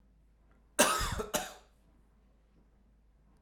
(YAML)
cough_length: 3.4 s
cough_amplitude: 8615
cough_signal_mean_std_ratio: 0.32
survey_phase: alpha (2021-03-01 to 2021-08-12)
age: 45-64
gender: Male
wearing_mask: 'No'
symptom_fatigue: true
symptom_change_to_sense_of_smell_or_taste: true
symptom_onset: 12 days
smoker_status: Never smoked
respiratory_condition_asthma: false
respiratory_condition_other: false
recruitment_source: REACT
submission_delay: 1 day
covid_test_result: Negative
covid_test_method: RT-qPCR